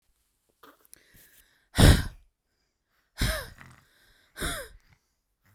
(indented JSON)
{
  "exhalation_length": "5.5 s",
  "exhalation_amplitude": 22444,
  "exhalation_signal_mean_std_ratio": 0.24,
  "survey_phase": "beta (2021-08-13 to 2022-03-07)",
  "age": "18-44",
  "gender": "Female",
  "wearing_mask": "No",
  "symptom_runny_or_blocked_nose": true,
  "symptom_sore_throat": true,
  "symptom_other": true,
  "smoker_status": "Never smoked",
  "respiratory_condition_asthma": false,
  "respiratory_condition_other": false,
  "recruitment_source": "Test and Trace",
  "submission_delay": "1 day",
  "covid_test_result": "Positive",
  "covid_test_method": "RT-qPCR",
  "covid_ct_value": 30.8,
  "covid_ct_gene": "N gene"
}